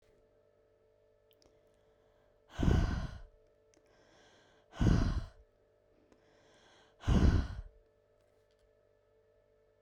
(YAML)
exhalation_length: 9.8 s
exhalation_amplitude: 6228
exhalation_signal_mean_std_ratio: 0.31
survey_phase: beta (2021-08-13 to 2022-03-07)
age: 18-44
gender: Female
wearing_mask: 'No'
symptom_none: true
smoker_status: Never smoked
respiratory_condition_asthma: false
respiratory_condition_other: false
recruitment_source: REACT
submission_delay: 1 day
covid_test_result: Negative
covid_test_method: RT-qPCR